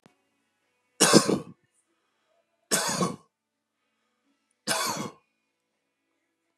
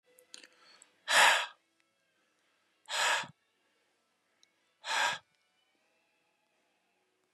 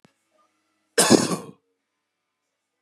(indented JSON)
{
  "three_cough_length": "6.6 s",
  "three_cough_amplitude": 27640,
  "three_cough_signal_mean_std_ratio": 0.29,
  "exhalation_length": "7.3 s",
  "exhalation_amplitude": 10966,
  "exhalation_signal_mean_std_ratio": 0.28,
  "cough_length": "2.8 s",
  "cough_amplitude": 32638,
  "cough_signal_mean_std_ratio": 0.26,
  "survey_phase": "beta (2021-08-13 to 2022-03-07)",
  "age": "45-64",
  "gender": "Male",
  "wearing_mask": "No",
  "symptom_none": true,
  "smoker_status": "Ex-smoker",
  "respiratory_condition_asthma": false,
  "respiratory_condition_other": false,
  "recruitment_source": "REACT",
  "submission_delay": "1 day",
  "covid_test_result": "Negative",
  "covid_test_method": "RT-qPCR",
  "influenza_a_test_result": "Unknown/Void",
  "influenza_b_test_result": "Unknown/Void"
}